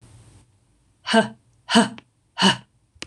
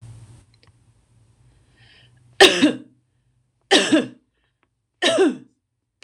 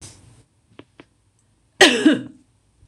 {"exhalation_length": "3.1 s", "exhalation_amplitude": 26027, "exhalation_signal_mean_std_ratio": 0.33, "three_cough_length": "6.0 s", "three_cough_amplitude": 26028, "three_cough_signal_mean_std_ratio": 0.31, "cough_length": "2.9 s", "cough_amplitude": 26028, "cough_signal_mean_std_ratio": 0.28, "survey_phase": "beta (2021-08-13 to 2022-03-07)", "age": "45-64", "gender": "Female", "wearing_mask": "No", "symptom_runny_or_blocked_nose": true, "smoker_status": "Never smoked", "respiratory_condition_asthma": false, "respiratory_condition_other": false, "recruitment_source": "Test and Trace", "submission_delay": "2 days", "covid_test_result": "Negative", "covid_test_method": "RT-qPCR"}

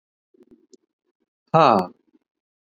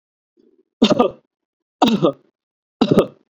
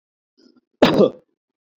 {"exhalation_length": "2.6 s", "exhalation_amplitude": 27590, "exhalation_signal_mean_std_ratio": 0.24, "three_cough_length": "3.3 s", "three_cough_amplitude": 29299, "three_cough_signal_mean_std_ratio": 0.37, "cough_length": "1.8 s", "cough_amplitude": 26906, "cough_signal_mean_std_ratio": 0.3, "survey_phase": "beta (2021-08-13 to 2022-03-07)", "age": "18-44", "gender": "Male", "wearing_mask": "No", "symptom_none": true, "symptom_onset": "13 days", "smoker_status": "Never smoked", "respiratory_condition_asthma": false, "respiratory_condition_other": false, "recruitment_source": "REACT", "submission_delay": "2 days", "covid_test_result": "Negative", "covid_test_method": "RT-qPCR"}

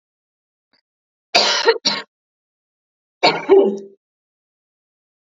{"cough_length": "5.2 s", "cough_amplitude": 32767, "cough_signal_mean_std_ratio": 0.33, "survey_phase": "beta (2021-08-13 to 2022-03-07)", "age": "18-44", "gender": "Female", "wearing_mask": "No", "symptom_cough_any": true, "symptom_runny_or_blocked_nose": true, "symptom_shortness_of_breath": true, "symptom_fatigue": true, "symptom_headache": true, "symptom_change_to_sense_of_smell_or_taste": true, "symptom_onset": "6 days", "smoker_status": "Ex-smoker", "respiratory_condition_asthma": false, "respiratory_condition_other": false, "recruitment_source": "Test and Trace", "submission_delay": "2 days", "covid_test_result": "Positive", "covid_test_method": "RT-qPCR", "covid_ct_value": 19.0, "covid_ct_gene": "ORF1ab gene", "covid_ct_mean": 19.5, "covid_viral_load": "390000 copies/ml", "covid_viral_load_category": "Low viral load (10K-1M copies/ml)"}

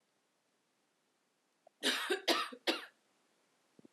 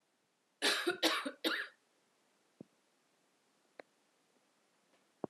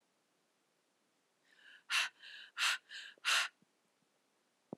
{"three_cough_length": "3.9 s", "three_cough_amplitude": 4606, "three_cough_signal_mean_std_ratio": 0.33, "cough_length": "5.3 s", "cough_amplitude": 4927, "cough_signal_mean_std_ratio": 0.31, "exhalation_length": "4.8 s", "exhalation_amplitude": 3497, "exhalation_signal_mean_std_ratio": 0.32, "survey_phase": "alpha (2021-03-01 to 2021-08-12)", "age": "18-44", "gender": "Female", "wearing_mask": "No", "symptom_none": true, "smoker_status": "Ex-smoker", "respiratory_condition_asthma": false, "respiratory_condition_other": false, "recruitment_source": "Test and Trace", "submission_delay": "0 days", "covid_test_result": "Negative", "covid_test_method": "RT-qPCR"}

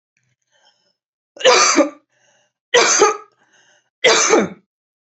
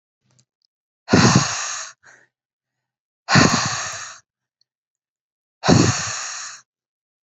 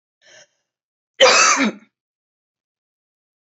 {"three_cough_length": "5.0 s", "three_cough_amplitude": 31671, "three_cough_signal_mean_std_ratio": 0.42, "exhalation_length": "7.3 s", "exhalation_amplitude": 30282, "exhalation_signal_mean_std_ratio": 0.38, "cough_length": "3.5 s", "cough_amplitude": 29989, "cough_signal_mean_std_ratio": 0.31, "survey_phase": "beta (2021-08-13 to 2022-03-07)", "age": "18-44", "gender": "Female", "wearing_mask": "No", "symptom_none": true, "smoker_status": "Never smoked", "respiratory_condition_asthma": true, "respiratory_condition_other": false, "recruitment_source": "REACT", "submission_delay": "2 days", "covid_test_result": "Negative", "covid_test_method": "RT-qPCR", "influenza_a_test_result": "Negative", "influenza_b_test_result": "Negative"}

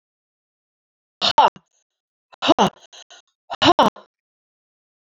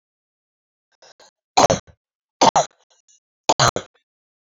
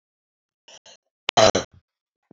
{"exhalation_length": "5.1 s", "exhalation_amplitude": 28231, "exhalation_signal_mean_std_ratio": 0.27, "three_cough_length": "4.5 s", "three_cough_amplitude": 28030, "three_cough_signal_mean_std_ratio": 0.26, "cough_length": "2.3 s", "cough_amplitude": 27321, "cough_signal_mean_std_ratio": 0.23, "survey_phase": "beta (2021-08-13 to 2022-03-07)", "age": "45-64", "gender": "Female", "wearing_mask": "No", "symptom_cough_any": true, "symptom_shortness_of_breath": true, "symptom_sore_throat": true, "symptom_headache": true, "symptom_change_to_sense_of_smell_or_taste": true, "smoker_status": "Never smoked", "respiratory_condition_asthma": false, "respiratory_condition_other": false, "recruitment_source": "Test and Trace", "submission_delay": "1 day", "covid_test_result": "Positive", "covid_test_method": "LFT"}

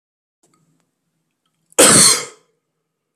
{"cough_length": "3.2 s", "cough_amplitude": 32768, "cough_signal_mean_std_ratio": 0.3, "survey_phase": "beta (2021-08-13 to 2022-03-07)", "age": "18-44", "gender": "Male", "wearing_mask": "No", "symptom_runny_or_blocked_nose": true, "smoker_status": "Current smoker (1 to 10 cigarettes per day)", "respiratory_condition_asthma": false, "respiratory_condition_other": false, "recruitment_source": "Test and Trace", "submission_delay": "1 day", "covid_test_result": "Positive", "covid_test_method": "RT-qPCR", "covid_ct_value": 25.5, "covid_ct_gene": "ORF1ab gene", "covid_ct_mean": 26.4, "covid_viral_load": "2200 copies/ml", "covid_viral_load_category": "Minimal viral load (< 10K copies/ml)"}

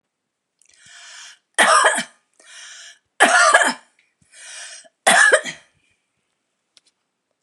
{"three_cough_length": "7.4 s", "three_cough_amplitude": 32489, "three_cough_signal_mean_std_ratio": 0.36, "survey_phase": "beta (2021-08-13 to 2022-03-07)", "age": "65+", "gender": "Female", "wearing_mask": "No", "symptom_runny_or_blocked_nose": true, "symptom_onset": "9 days", "smoker_status": "Ex-smoker", "respiratory_condition_asthma": false, "respiratory_condition_other": false, "recruitment_source": "REACT", "submission_delay": "1 day", "covid_test_result": "Negative", "covid_test_method": "RT-qPCR", "influenza_a_test_result": "Negative", "influenza_b_test_result": "Negative"}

